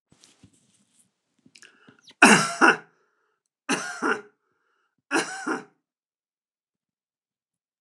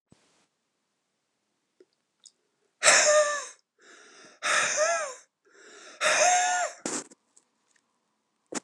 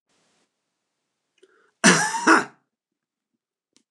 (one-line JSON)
{"three_cough_length": "7.8 s", "three_cough_amplitude": 29203, "three_cough_signal_mean_std_ratio": 0.25, "exhalation_length": "8.6 s", "exhalation_amplitude": 21766, "exhalation_signal_mean_std_ratio": 0.41, "cough_length": "3.9 s", "cough_amplitude": 28455, "cough_signal_mean_std_ratio": 0.27, "survey_phase": "alpha (2021-03-01 to 2021-08-12)", "age": "65+", "gender": "Male", "wearing_mask": "No", "symptom_none": true, "smoker_status": "Ex-smoker", "respiratory_condition_asthma": false, "respiratory_condition_other": false, "recruitment_source": "REACT", "submission_delay": "2 days", "covid_test_result": "Negative", "covid_test_method": "RT-qPCR"}